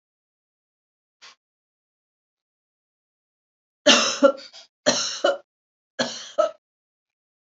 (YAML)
three_cough_length: 7.6 s
three_cough_amplitude: 27608
three_cough_signal_mean_std_ratio: 0.27
survey_phase: beta (2021-08-13 to 2022-03-07)
age: 45-64
gender: Female
wearing_mask: 'No'
symptom_none: true
smoker_status: Ex-smoker
respiratory_condition_asthma: false
respiratory_condition_other: false
recruitment_source: REACT
submission_delay: 1 day
covid_test_result: Negative
covid_test_method: RT-qPCR
influenza_a_test_result: Negative
influenza_b_test_result: Negative